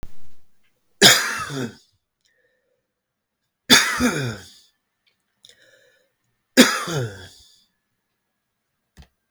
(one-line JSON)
{"three_cough_length": "9.3 s", "three_cough_amplitude": 32768, "three_cough_signal_mean_std_ratio": 0.31, "survey_phase": "beta (2021-08-13 to 2022-03-07)", "age": "45-64", "gender": "Male", "wearing_mask": "No", "symptom_fatigue": true, "smoker_status": "Never smoked", "respiratory_condition_asthma": false, "respiratory_condition_other": false, "recruitment_source": "REACT", "submission_delay": "1 day", "covid_test_result": "Negative", "covid_test_method": "RT-qPCR"}